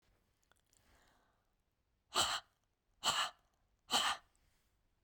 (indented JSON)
{
  "exhalation_length": "5.0 s",
  "exhalation_amplitude": 3620,
  "exhalation_signal_mean_std_ratio": 0.32,
  "survey_phase": "beta (2021-08-13 to 2022-03-07)",
  "age": "65+",
  "gender": "Male",
  "wearing_mask": "No",
  "symptom_fatigue": true,
  "symptom_change_to_sense_of_smell_or_taste": true,
  "smoker_status": "Never smoked",
  "respiratory_condition_asthma": true,
  "respiratory_condition_other": false,
  "recruitment_source": "Test and Trace",
  "submission_delay": "1 day",
  "covid_test_result": "Negative",
  "covid_test_method": "ePCR"
}